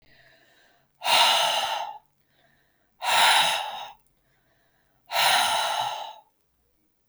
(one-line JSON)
{"exhalation_length": "7.1 s", "exhalation_amplitude": 15574, "exhalation_signal_mean_std_ratio": 0.49, "survey_phase": "beta (2021-08-13 to 2022-03-07)", "age": "45-64", "gender": "Female", "wearing_mask": "No", "symptom_none": true, "symptom_onset": "12 days", "smoker_status": "Never smoked", "respiratory_condition_asthma": false, "respiratory_condition_other": false, "recruitment_source": "REACT", "submission_delay": "1 day", "covid_test_result": "Negative", "covid_test_method": "RT-qPCR", "influenza_a_test_result": "Negative", "influenza_b_test_result": "Negative"}